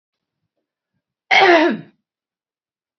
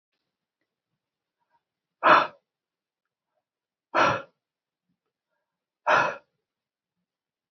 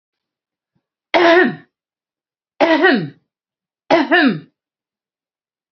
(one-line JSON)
{"cough_length": "3.0 s", "cough_amplitude": 28913, "cough_signal_mean_std_ratio": 0.32, "exhalation_length": "7.5 s", "exhalation_amplitude": 19492, "exhalation_signal_mean_std_ratio": 0.23, "three_cough_length": "5.7 s", "three_cough_amplitude": 29736, "three_cough_signal_mean_std_ratio": 0.39, "survey_phase": "beta (2021-08-13 to 2022-03-07)", "age": "45-64", "gender": "Female", "wearing_mask": "No", "symptom_none": true, "smoker_status": "Never smoked", "respiratory_condition_asthma": false, "respiratory_condition_other": false, "recruitment_source": "REACT", "submission_delay": "2 days", "covid_test_result": "Negative", "covid_test_method": "RT-qPCR", "influenza_a_test_result": "Negative", "influenza_b_test_result": "Negative"}